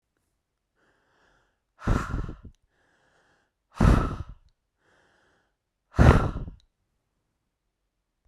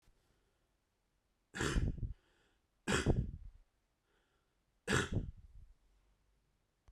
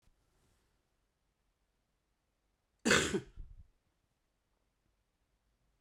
{"exhalation_length": "8.3 s", "exhalation_amplitude": 25286, "exhalation_signal_mean_std_ratio": 0.26, "three_cough_length": "6.9 s", "three_cough_amplitude": 3653, "three_cough_signal_mean_std_ratio": 0.36, "cough_length": "5.8 s", "cough_amplitude": 7043, "cough_signal_mean_std_ratio": 0.2, "survey_phase": "beta (2021-08-13 to 2022-03-07)", "age": "18-44", "gender": "Male", "wearing_mask": "No", "symptom_runny_or_blocked_nose": true, "symptom_other": true, "smoker_status": "Never smoked", "respiratory_condition_asthma": false, "respiratory_condition_other": false, "recruitment_source": "Test and Trace", "submission_delay": "1 day", "covid_test_result": "Positive", "covid_test_method": "RT-qPCR", "covid_ct_value": 24.8, "covid_ct_gene": "ORF1ab gene"}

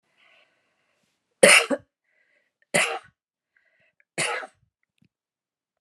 {"three_cough_length": "5.8 s", "three_cough_amplitude": 30675, "three_cough_signal_mean_std_ratio": 0.23, "survey_phase": "beta (2021-08-13 to 2022-03-07)", "age": "65+", "gender": "Female", "wearing_mask": "No", "symptom_none": true, "smoker_status": "Never smoked", "respiratory_condition_asthma": false, "respiratory_condition_other": false, "recruitment_source": "REACT", "submission_delay": "1 day", "covid_test_result": "Negative", "covid_test_method": "RT-qPCR", "influenza_a_test_result": "Negative", "influenza_b_test_result": "Negative"}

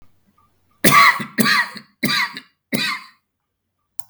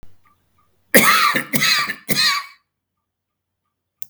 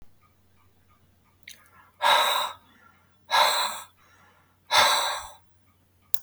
{"three_cough_length": "4.1 s", "three_cough_amplitude": 32767, "three_cough_signal_mean_std_ratio": 0.41, "cough_length": "4.1 s", "cough_amplitude": 32766, "cough_signal_mean_std_ratio": 0.44, "exhalation_length": "6.2 s", "exhalation_amplitude": 32766, "exhalation_signal_mean_std_ratio": 0.4, "survey_phase": "beta (2021-08-13 to 2022-03-07)", "age": "45-64", "gender": "Male", "wearing_mask": "No", "symptom_none": true, "smoker_status": "Never smoked", "respiratory_condition_asthma": false, "respiratory_condition_other": false, "recruitment_source": "REACT", "submission_delay": "1 day", "covid_test_result": "Negative", "covid_test_method": "RT-qPCR", "influenza_a_test_result": "Negative", "influenza_b_test_result": "Negative"}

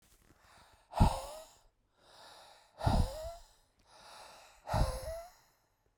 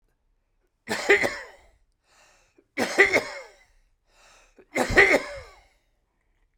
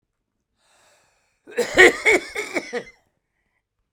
{"exhalation_length": "6.0 s", "exhalation_amplitude": 6853, "exhalation_signal_mean_std_ratio": 0.35, "three_cough_length": "6.6 s", "three_cough_amplitude": 25979, "three_cough_signal_mean_std_ratio": 0.33, "cough_length": "3.9 s", "cough_amplitude": 32767, "cough_signal_mean_std_ratio": 0.3, "survey_phase": "beta (2021-08-13 to 2022-03-07)", "age": "45-64", "gender": "Male", "wearing_mask": "No", "symptom_none": true, "smoker_status": "Current smoker (11 or more cigarettes per day)", "respiratory_condition_asthma": false, "respiratory_condition_other": false, "recruitment_source": "REACT", "submission_delay": "1 day", "covid_test_result": "Negative", "covid_test_method": "RT-qPCR"}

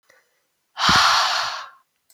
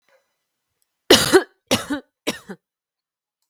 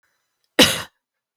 {"exhalation_length": "2.1 s", "exhalation_amplitude": 23246, "exhalation_signal_mean_std_ratio": 0.51, "three_cough_length": "3.5 s", "three_cough_amplitude": 32768, "three_cough_signal_mean_std_ratio": 0.27, "cough_length": "1.4 s", "cough_amplitude": 32768, "cough_signal_mean_std_ratio": 0.26, "survey_phase": "beta (2021-08-13 to 2022-03-07)", "age": "18-44", "gender": "Female", "wearing_mask": "No", "symptom_cough_any": true, "symptom_onset": "6 days", "smoker_status": "Ex-smoker", "respiratory_condition_asthma": false, "respiratory_condition_other": false, "recruitment_source": "REACT", "submission_delay": "2 days", "covid_test_result": "Negative", "covid_test_method": "RT-qPCR"}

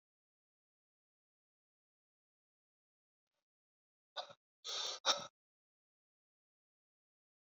{"exhalation_length": "7.4 s", "exhalation_amplitude": 4339, "exhalation_signal_mean_std_ratio": 0.18, "survey_phase": "beta (2021-08-13 to 2022-03-07)", "age": "65+", "gender": "Male", "wearing_mask": "No", "symptom_none": true, "smoker_status": "Never smoked", "respiratory_condition_asthma": false, "respiratory_condition_other": false, "recruitment_source": "REACT", "submission_delay": "2 days", "covid_test_result": "Negative", "covid_test_method": "RT-qPCR"}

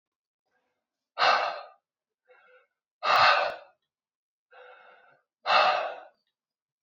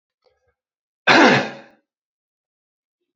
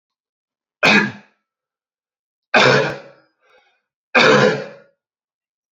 {"exhalation_length": "6.8 s", "exhalation_amplitude": 13051, "exhalation_signal_mean_std_ratio": 0.35, "cough_length": "3.2 s", "cough_amplitude": 29740, "cough_signal_mean_std_ratio": 0.28, "three_cough_length": "5.7 s", "three_cough_amplitude": 30673, "three_cough_signal_mean_std_ratio": 0.36, "survey_phase": "alpha (2021-03-01 to 2021-08-12)", "age": "18-44", "gender": "Male", "wearing_mask": "No", "symptom_fatigue": true, "symptom_change_to_sense_of_smell_or_taste": true, "symptom_loss_of_taste": true, "symptom_onset": "2 days", "smoker_status": "Never smoked", "respiratory_condition_asthma": false, "respiratory_condition_other": false, "recruitment_source": "REACT", "submission_delay": "2 days", "covid_test_result": "Negative", "covid_test_method": "RT-qPCR"}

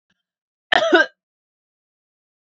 {"cough_length": "2.5 s", "cough_amplitude": 32767, "cough_signal_mean_std_ratio": 0.27, "survey_phase": "alpha (2021-03-01 to 2021-08-12)", "age": "18-44", "gender": "Female", "wearing_mask": "No", "symptom_cough_any": true, "symptom_new_continuous_cough": true, "symptom_fatigue": true, "symptom_change_to_sense_of_smell_or_taste": true, "symptom_loss_of_taste": true, "smoker_status": "Never smoked", "respiratory_condition_asthma": false, "respiratory_condition_other": false, "recruitment_source": "Test and Trace", "submission_delay": "2 days", "covid_test_result": "Positive", "covid_test_method": "RT-qPCR", "covid_ct_value": 18.5, "covid_ct_gene": "N gene", "covid_ct_mean": 19.1, "covid_viral_load": "530000 copies/ml", "covid_viral_load_category": "Low viral load (10K-1M copies/ml)"}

